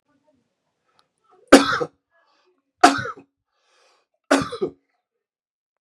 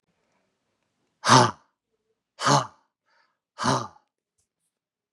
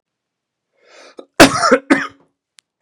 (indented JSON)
{
  "three_cough_length": "5.8 s",
  "three_cough_amplitude": 32768,
  "three_cough_signal_mean_std_ratio": 0.23,
  "exhalation_length": "5.1 s",
  "exhalation_amplitude": 25475,
  "exhalation_signal_mean_std_ratio": 0.27,
  "cough_length": "2.8 s",
  "cough_amplitude": 32768,
  "cough_signal_mean_std_ratio": 0.3,
  "survey_phase": "beta (2021-08-13 to 2022-03-07)",
  "age": "45-64",
  "gender": "Male",
  "wearing_mask": "No",
  "symptom_cough_any": true,
  "symptom_runny_or_blocked_nose": true,
  "symptom_headache": true,
  "symptom_change_to_sense_of_smell_or_taste": true,
  "smoker_status": "Ex-smoker",
  "respiratory_condition_asthma": false,
  "respiratory_condition_other": false,
  "recruitment_source": "Test and Trace",
  "submission_delay": "2 days",
  "covid_test_result": "Positive",
  "covid_test_method": "RT-qPCR"
}